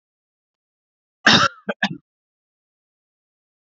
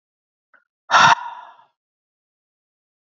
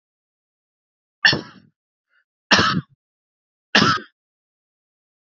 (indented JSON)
{
  "cough_length": "3.7 s",
  "cough_amplitude": 29639,
  "cough_signal_mean_std_ratio": 0.23,
  "exhalation_length": "3.1 s",
  "exhalation_amplitude": 30234,
  "exhalation_signal_mean_std_ratio": 0.25,
  "three_cough_length": "5.4 s",
  "three_cough_amplitude": 30735,
  "three_cough_signal_mean_std_ratio": 0.27,
  "survey_phase": "beta (2021-08-13 to 2022-03-07)",
  "age": "18-44",
  "gender": "Male",
  "wearing_mask": "No",
  "symptom_none": true,
  "smoker_status": "Ex-smoker",
  "respiratory_condition_asthma": false,
  "respiratory_condition_other": false,
  "recruitment_source": "REACT",
  "submission_delay": "3 days",
  "covid_test_result": "Negative",
  "covid_test_method": "RT-qPCR"
}